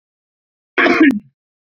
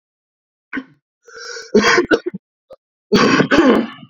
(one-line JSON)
{"cough_length": "1.8 s", "cough_amplitude": 32767, "cough_signal_mean_std_ratio": 0.39, "three_cough_length": "4.1 s", "three_cough_amplitude": 29967, "three_cough_signal_mean_std_ratio": 0.47, "survey_phase": "beta (2021-08-13 to 2022-03-07)", "age": "18-44", "gender": "Male", "wearing_mask": "No", "symptom_cough_any": true, "symptom_onset": "13 days", "smoker_status": "Never smoked", "respiratory_condition_asthma": true, "respiratory_condition_other": false, "recruitment_source": "REACT", "submission_delay": "1 day", "covid_test_result": "Negative", "covid_test_method": "RT-qPCR", "influenza_a_test_result": "Negative", "influenza_b_test_result": "Negative"}